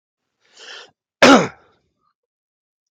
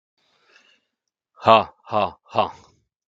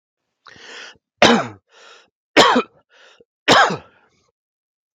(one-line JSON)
{"cough_length": "2.9 s", "cough_amplitude": 32766, "cough_signal_mean_std_ratio": 0.24, "exhalation_length": "3.1 s", "exhalation_amplitude": 32768, "exhalation_signal_mean_std_ratio": 0.27, "three_cough_length": "4.9 s", "three_cough_amplitude": 32766, "three_cough_signal_mean_std_ratio": 0.32, "survey_phase": "beta (2021-08-13 to 2022-03-07)", "age": "45-64", "gender": "Male", "wearing_mask": "No", "symptom_none": true, "smoker_status": "Ex-smoker", "respiratory_condition_asthma": false, "respiratory_condition_other": false, "recruitment_source": "REACT", "submission_delay": "4 days", "covid_test_result": "Negative", "covid_test_method": "RT-qPCR", "influenza_a_test_result": "Negative", "influenza_b_test_result": "Negative"}